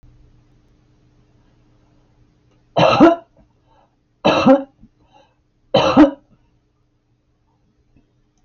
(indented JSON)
{
  "three_cough_length": "8.4 s",
  "three_cough_amplitude": 28999,
  "three_cough_signal_mean_std_ratio": 0.29,
  "survey_phase": "alpha (2021-03-01 to 2021-08-12)",
  "age": "65+",
  "gender": "Female",
  "wearing_mask": "No",
  "symptom_none": true,
  "smoker_status": "Ex-smoker",
  "respiratory_condition_asthma": false,
  "respiratory_condition_other": false,
  "recruitment_source": "REACT",
  "submission_delay": "2 days",
  "covid_test_result": "Negative",
  "covid_test_method": "RT-qPCR"
}